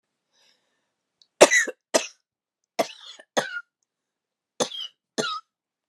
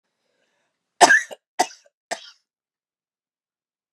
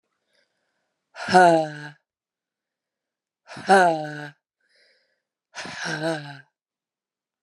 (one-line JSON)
{"three_cough_length": "5.9 s", "three_cough_amplitude": 32768, "three_cough_signal_mean_std_ratio": 0.24, "cough_length": "3.9 s", "cough_amplitude": 32767, "cough_signal_mean_std_ratio": 0.2, "exhalation_length": "7.4 s", "exhalation_amplitude": 28544, "exhalation_signal_mean_std_ratio": 0.3, "survey_phase": "beta (2021-08-13 to 2022-03-07)", "age": "45-64", "gender": "Female", "wearing_mask": "No", "symptom_fatigue": true, "smoker_status": "Never smoked", "respiratory_condition_asthma": true, "respiratory_condition_other": false, "recruitment_source": "REACT", "submission_delay": "2 days", "covid_test_result": "Negative", "covid_test_method": "RT-qPCR"}